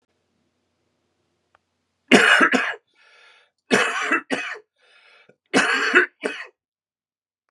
{
  "three_cough_length": "7.5 s",
  "three_cough_amplitude": 32767,
  "three_cough_signal_mean_std_ratio": 0.37,
  "survey_phase": "beta (2021-08-13 to 2022-03-07)",
  "age": "45-64",
  "gender": "Male",
  "wearing_mask": "No",
  "symptom_cough_any": true,
  "symptom_onset": "12 days",
  "smoker_status": "Current smoker (1 to 10 cigarettes per day)",
  "respiratory_condition_asthma": false,
  "respiratory_condition_other": false,
  "recruitment_source": "REACT",
  "submission_delay": "1 day",
  "covid_test_result": "Negative",
  "covid_test_method": "RT-qPCR",
  "influenza_a_test_result": "Negative",
  "influenza_b_test_result": "Negative"
}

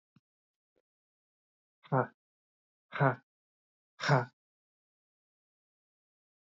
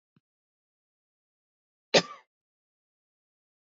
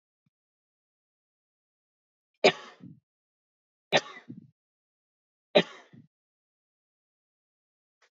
{
  "exhalation_length": "6.5 s",
  "exhalation_amplitude": 6041,
  "exhalation_signal_mean_std_ratio": 0.22,
  "cough_length": "3.8 s",
  "cough_amplitude": 17502,
  "cough_signal_mean_std_ratio": 0.11,
  "three_cough_length": "8.1 s",
  "three_cough_amplitude": 16381,
  "three_cough_signal_mean_std_ratio": 0.14,
  "survey_phase": "beta (2021-08-13 to 2022-03-07)",
  "age": "18-44",
  "gender": "Male",
  "wearing_mask": "No",
  "symptom_cough_any": true,
  "symptom_new_continuous_cough": true,
  "symptom_runny_or_blocked_nose": true,
  "symptom_headache": true,
  "smoker_status": "Never smoked",
  "respiratory_condition_asthma": true,
  "respiratory_condition_other": false,
  "recruitment_source": "Test and Trace",
  "submission_delay": "1 day",
  "covid_test_result": "Positive",
  "covid_test_method": "LFT"
}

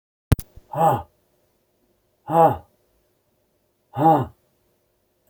{
  "exhalation_length": "5.3 s",
  "exhalation_amplitude": 31182,
  "exhalation_signal_mean_std_ratio": 0.3,
  "survey_phase": "beta (2021-08-13 to 2022-03-07)",
  "age": "45-64",
  "gender": "Male",
  "wearing_mask": "No",
  "symptom_cough_any": true,
  "symptom_shortness_of_breath": true,
  "symptom_fatigue": true,
  "symptom_onset": "13 days",
  "smoker_status": "Never smoked",
  "respiratory_condition_asthma": false,
  "respiratory_condition_other": false,
  "recruitment_source": "REACT",
  "submission_delay": "2 days",
  "covid_test_result": "Negative",
  "covid_test_method": "RT-qPCR",
  "influenza_a_test_result": "Negative",
  "influenza_b_test_result": "Negative"
}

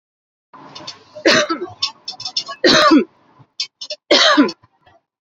{
  "three_cough_length": "5.2 s",
  "three_cough_amplitude": 30771,
  "three_cough_signal_mean_std_ratio": 0.44,
  "survey_phase": "beta (2021-08-13 to 2022-03-07)",
  "age": "45-64",
  "gender": "Female",
  "wearing_mask": "No",
  "symptom_none": true,
  "smoker_status": "Never smoked",
  "respiratory_condition_asthma": false,
  "respiratory_condition_other": false,
  "recruitment_source": "REACT",
  "submission_delay": "8 days",
  "covid_test_result": "Negative",
  "covid_test_method": "RT-qPCR"
}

